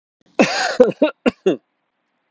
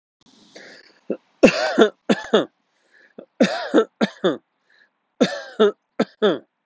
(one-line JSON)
{"cough_length": "2.3 s", "cough_amplitude": 31815, "cough_signal_mean_std_ratio": 0.4, "three_cough_length": "6.7 s", "three_cough_amplitude": 32766, "three_cough_signal_mean_std_ratio": 0.38, "survey_phase": "alpha (2021-03-01 to 2021-08-12)", "age": "45-64", "gender": "Male", "wearing_mask": "No", "symptom_none": true, "smoker_status": "Never smoked", "respiratory_condition_asthma": false, "respiratory_condition_other": false, "recruitment_source": "REACT", "submission_delay": "1 day", "covid_test_result": "Negative", "covid_test_method": "RT-qPCR"}